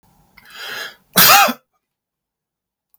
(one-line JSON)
{"cough_length": "3.0 s", "cough_amplitude": 32768, "cough_signal_mean_std_ratio": 0.31, "survey_phase": "beta (2021-08-13 to 2022-03-07)", "age": "65+", "gender": "Male", "wearing_mask": "No", "symptom_none": true, "smoker_status": "Never smoked", "respiratory_condition_asthma": false, "respiratory_condition_other": false, "recruitment_source": "REACT", "submission_delay": "2 days", "covid_test_result": "Negative", "covid_test_method": "RT-qPCR", "influenza_a_test_result": "Unknown/Void", "influenza_b_test_result": "Unknown/Void"}